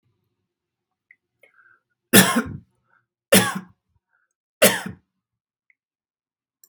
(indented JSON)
{
  "three_cough_length": "6.7 s",
  "three_cough_amplitude": 32768,
  "three_cough_signal_mean_std_ratio": 0.24,
  "survey_phase": "beta (2021-08-13 to 2022-03-07)",
  "age": "45-64",
  "gender": "Male",
  "wearing_mask": "No",
  "symptom_none": true,
  "smoker_status": "Ex-smoker",
  "respiratory_condition_asthma": false,
  "respiratory_condition_other": false,
  "recruitment_source": "REACT",
  "submission_delay": "19 days",
  "covid_test_result": "Negative",
  "covid_test_method": "RT-qPCR"
}